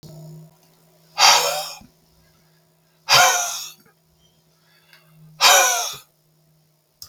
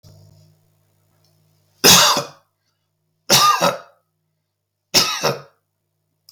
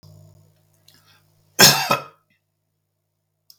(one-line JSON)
{"exhalation_length": "7.1 s", "exhalation_amplitude": 32766, "exhalation_signal_mean_std_ratio": 0.36, "three_cough_length": "6.3 s", "three_cough_amplitude": 32768, "three_cough_signal_mean_std_ratio": 0.34, "cough_length": "3.6 s", "cough_amplitude": 32768, "cough_signal_mean_std_ratio": 0.23, "survey_phase": "beta (2021-08-13 to 2022-03-07)", "age": "65+", "gender": "Male", "wearing_mask": "No", "symptom_none": true, "symptom_onset": "12 days", "smoker_status": "Never smoked", "respiratory_condition_asthma": false, "respiratory_condition_other": false, "recruitment_source": "REACT", "submission_delay": "1 day", "covid_test_result": "Negative", "covid_test_method": "RT-qPCR", "influenza_a_test_result": "Negative", "influenza_b_test_result": "Negative"}